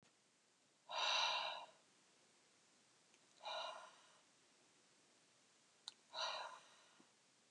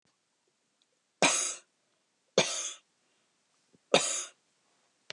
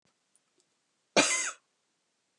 {"exhalation_length": "7.5 s", "exhalation_amplitude": 1526, "exhalation_signal_mean_std_ratio": 0.39, "three_cough_length": "5.1 s", "three_cough_amplitude": 14542, "three_cough_signal_mean_std_ratio": 0.29, "cough_length": "2.4 s", "cough_amplitude": 11054, "cough_signal_mean_std_ratio": 0.27, "survey_phase": "beta (2021-08-13 to 2022-03-07)", "age": "45-64", "gender": "Female", "wearing_mask": "No", "symptom_sore_throat": true, "symptom_fatigue": true, "symptom_fever_high_temperature": true, "symptom_headache": true, "smoker_status": "Never smoked", "respiratory_condition_asthma": true, "respiratory_condition_other": false, "recruitment_source": "Test and Trace", "submission_delay": "0 days", "covid_test_result": "Positive", "covid_test_method": "LFT"}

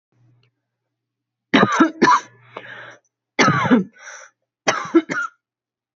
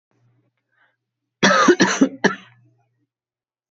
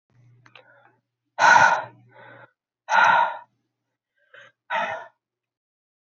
{"three_cough_length": "6.0 s", "three_cough_amplitude": 32768, "three_cough_signal_mean_std_ratio": 0.39, "cough_length": "3.8 s", "cough_amplitude": 27543, "cough_signal_mean_std_ratio": 0.34, "exhalation_length": "6.1 s", "exhalation_amplitude": 22204, "exhalation_signal_mean_std_ratio": 0.33, "survey_phase": "beta (2021-08-13 to 2022-03-07)", "age": "18-44", "gender": "Female", "wearing_mask": "No", "symptom_cough_any": true, "symptom_runny_or_blocked_nose": true, "symptom_fatigue": true, "symptom_fever_high_temperature": true, "symptom_headache": true, "symptom_change_to_sense_of_smell_or_taste": true, "symptom_onset": "4 days", "smoker_status": "Never smoked", "respiratory_condition_asthma": false, "respiratory_condition_other": false, "recruitment_source": "Test and Trace", "submission_delay": "2 days", "covid_test_result": "Positive", "covid_test_method": "ePCR"}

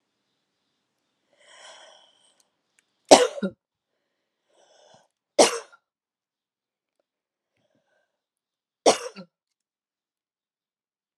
{"three_cough_length": "11.2 s", "three_cough_amplitude": 32768, "three_cough_signal_mean_std_ratio": 0.15, "survey_phase": "alpha (2021-03-01 to 2021-08-12)", "age": "45-64", "gender": "Female", "wearing_mask": "No", "symptom_none": true, "symptom_onset": "12 days", "smoker_status": "Never smoked", "respiratory_condition_asthma": true, "respiratory_condition_other": false, "recruitment_source": "REACT", "submission_delay": "2 days", "covid_test_result": "Negative", "covid_test_method": "RT-qPCR"}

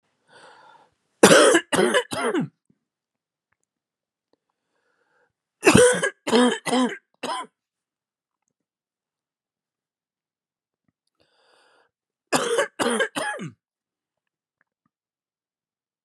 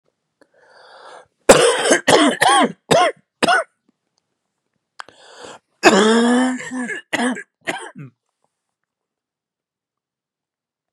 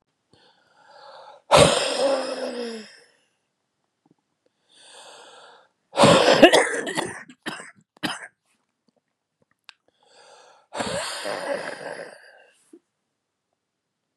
{"three_cough_length": "16.0 s", "three_cough_amplitude": 32547, "three_cough_signal_mean_std_ratio": 0.31, "cough_length": "10.9 s", "cough_amplitude": 32768, "cough_signal_mean_std_ratio": 0.4, "exhalation_length": "14.2 s", "exhalation_amplitude": 32767, "exhalation_signal_mean_std_ratio": 0.32, "survey_phase": "beta (2021-08-13 to 2022-03-07)", "age": "45-64", "gender": "Male", "wearing_mask": "No", "symptom_cough_any": true, "symptom_runny_or_blocked_nose": true, "symptom_fatigue": true, "symptom_headache": true, "symptom_change_to_sense_of_smell_or_taste": true, "symptom_onset": "3 days", "smoker_status": "Never smoked", "respiratory_condition_asthma": false, "respiratory_condition_other": true, "recruitment_source": "Test and Trace", "submission_delay": "1 day", "covid_test_result": "Positive", "covid_test_method": "RT-qPCR", "covid_ct_value": 31.2, "covid_ct_gene": "ORF1ab gene"}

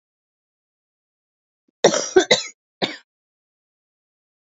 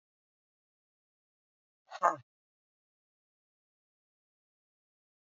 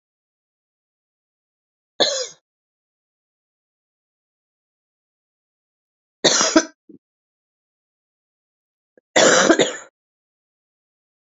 {"cough_length": "4.4 s", "cough_amplitude": 28645, "cough_signal_mean_std_ratio": 0.23, "exhalation_length": "5.3 s", "exhalation_amplitude": 8565, "exhalation_signal_mean_std_ratio": 0.11, "three_cough_length": "11.3 s", "three_cough_amplitude": 29631, "three_cough_signal_mean_std_ratio": 0.24, "survey_phase": "alpha (2021-03-01 to 2021-08-12)", "age": "45-64", "gender": "Female", "wearing_mask": "No", "symptom_cough_any": true, "symptom_new_continuous_cough": true, "symptom_shortness_of_breath": true, "symptom_fatigue": true, "symptom_fever_high_temperature": true, "symptom_headache": true, "symptom_change_to_sense_of_smell_or_taste": true, "symptom_loss_of_taste": true, "symptom_onset": "7 days", "smoker_status": "Current smoker (1 to 10 cigarettes per day)", "respiratory_condition_asthma": false, "respiratory_condition_other": false, "recruitment_source": "Test and Trace", "submission_delay": "3 days", "covid_test_result": "Positive", "covid_test_method": "RT-qPCR", "covid_ct_value": 22.3, "covid_ct_gene": "ORF1ab gene", "covid_ct_mean": 22.7, "covid_viral_load": "37000 copies/ml", "covid_viral_load_category": "Low viral load (10K-1M copies/ml)"}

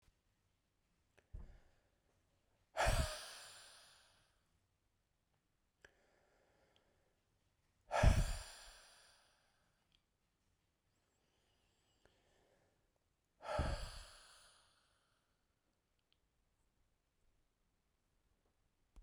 {"exhalation_length": "19.0 s", "exhalation_amplitude": 3829, "exhalation_signal_mean_std_ratio": 0.22, "survey_phase": "beta (2021-08-13 to 2022-03-07)", "age": "45-64", "gender": "Male", "wearing_mask": "No", "symptom_cough_any": true, "symptom_runny_or_blocked_nose": true, "symptom_shortness_of_breath": true, "symptom_sore_throat": true, "symptom_abdominal_pain": true, "symptom_fatigue": true, "symptom_headache": true, "symptom_other": true, "symptom_onset": "5 days", "smoker_status": "Never smoked", "respiratory_condition_asthma": false, "respiratory_condition_other": false, "recruitment_source": "Test and Trace", "submission_delay": "2 days", "covid_test_result": "Positive", "covid_test_method": "RT-qPCR", "covid_ct_value": 26.7, "covid_ct_gene": "ORF1ab gene", "covid_ct_mean": 27.7, "covid_viral_load": "830 copies/ml", "covid_viral_load_category": "Minimal viral load (< 10K copies/ml)"}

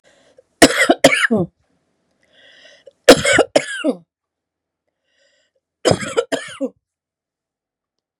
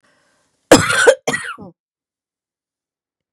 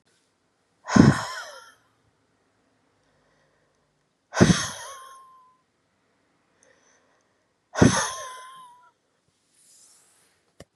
{"three_cough_length": "8.2 s", "three_cough_amplitude": 32768, "three_cough_signal_mean_std_ratio": 0.31, "cough_length": "3.3 s", "cough_amplitude": 32768, "cough_signal_mean_std_ratio": 0.29, "exhalation_length": "10.8 s", "exhalation_amplitude": 31747, "exhalation_signal_mean_std_ratio": 0.23, "survey_phase": "beta (2021-08-13 to 2022-03-07)", "age": "45-64", "gender": "Female", "wearing_mask": "No", "symptom_cough_any": true, "symptom_sore_throat": true, "symptom_headache": true, "symptom_onset": "12 days", "smoker_status": "Current smoker (11 or more cigarettes per day)", "respiratory_condition_asthma": false, "respiratory_condition_other": false, "recruitment_source": "REACT", "submission_delay": "2 days", "covid_test_result": "Negative", "covid_test_method": "RT-qPCR"}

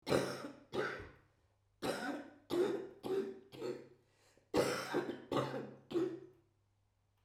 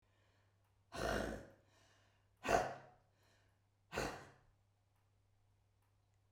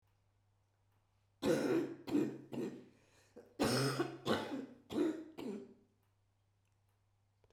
{"cough_length": "7.2 s", "cough_amplitude": 4019, "cough_signal_mean_std_ratio": 0.57, "exhalation_length": "6.3 s", "exhalation_amplitude": 4010, "exhalation_signal_mean_std_ratio": 0.32, "three_cough_length": "7.5 s", "three_cough_amplitude": 2900, "three_cough_signal_mean_std_ratio": 0.48, "survey_phase": "beta (2021-08-13 to 2022-03-07)", "age": "65+", "gender": "Female", "wearing_mask": "No", "symptom_cough_any": true, "symptom_runny_or_blocked_nose": true, "symptom_sore_throat": true, "symptom_fatigue": true, "symptom_onset": "9 days", "smoker_status": "Ex-smoker", "respiratory_condition_asthma": false, "respiratory_condition_other": true, "recruitment_source": "Test and Trace", "submission_delay": "3 days", "covid_test_result": "Positive", "covid_test_method": "RT-qPCR", "covid_ct_value": 17.3, "covid_ct_gene": "ORF1ab gene"}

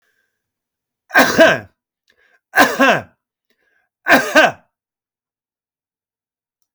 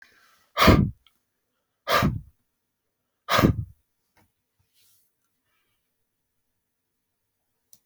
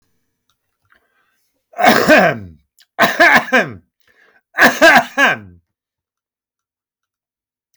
{"three_cough_length": "6.7 s", "three_cough_amplitude": 32768, "three_cough_signal_mean_std_ratio": 0.33, "exhalation_length": "7.9 s", "exhalation_amplitude": 24257, "exhalation_signal_mean_std_ratio": 0.25, "cough_length": "7.8 s", "cough_amplitude": 32768, "cough_signal_mean_std_ratio": 0.38, "survey_phase": "alpha (2021-03-01 to 2021-08-12)", "age": "45-64", "gender": "Male", "wearing_mask": "No", "symptom_none": true, "smoker_status": "Current smoker (11 or more cigarettes per day)", "respiratory_condition_asthma": false, "respiratory_condition_other": false, "recruitment_source": "REACT", "submission_delay": "1 day", "covid_test_result": "Negative", "covid_test_method": "RT-qPCR"}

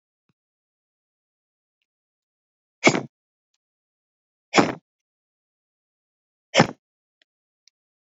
{"exhalation_length": "8.2 s", "exhalation_amplitude": 27943, "exhalation_signal_mean_std_ratio": 0.16, "survey_phase": "beta (2021-08-13 to 2022-03-07)", "age": "45-64", "gender": "Male", "wearing_mask": "No", "symptom_none": true, "smoker_status": "Current smoker (11 or more cigarettes per day)", "respiratory_condition_asthma": false, "respiratory_condition_other": false, "recruitment_source": "REACT", "submission_delay": "1 day", "covid_test_result": "Negative", "covid_test_method": "RT-qPCR"}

